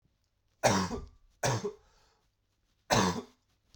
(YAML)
three_cough_length: 3.8 s
three_cough_amplitude: 10777
three_cough_signal_mean_std_ratio: 0.39
survey_phase: beta (2021-08-13 to 2022-03-07)
age: 18-44
gender: Male
wearing_mask: 'No'
symptom_cough_any: true
symptom_new_continuous_cough: true
symptom_runny_or_blocked_nose: true
symptom_shortness_of_breath: true
symptom_sore_throat: true
symptom_fatigue: true
symptom_fever_high_temperature: true
symptom_headache: true
symptom_onset: 6 days
smoker_status: Never smoked
respiratory_condition_asthma: false
respiratory_condition_other: false
recruitment_source: Test and Trace
submission_delay: 2 days
covid_test_result: Positive
covid_test_method: RT-qPCR